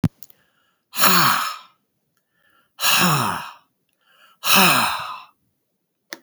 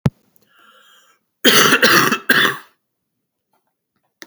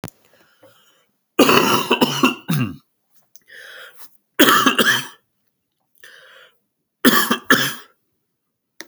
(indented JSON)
{
  "exhalation_length": "6.2 s",
  "exhalation_amplitude": 32768,
  "exhalation_signal_mean_std_ratio": 0.44,
  "cough_length": "4.3 s",
  "cough_amplitude": 32768,
  "cough_signal_mean_std_ratio": 0.39,
  "three_cough_length": "8.9 s",
  "three_cough_amplitude": 32768,
  "three_cough_signal_mean_std_ratio": 0.4,
  "survey_phase": "beta (2021-08-13 to 2022-03-07)",
  "age": "45-64",
  "gender": "Male",
  "wearing_mask": "No",
  "symptom_cough_any": true,
  "symptom_runny_or_blocked_nose": true,
  "symptom_headache": true,
  "symptom_onset": "3 days",
  "smoker_status": "Never smoked",
  "respiratory_condition_asthma": false,
  "respiratory_condition_other": false,
  "recruitment_source": "Test and Trace",
  "submission_delay": "2 days",
  "covid_test_result": "Positive",
  "covid_test_method": "RT-qPCR",
  "covid_ct_value": 21.6,
  "covid_ct_gene": "ORF1ab gene"
}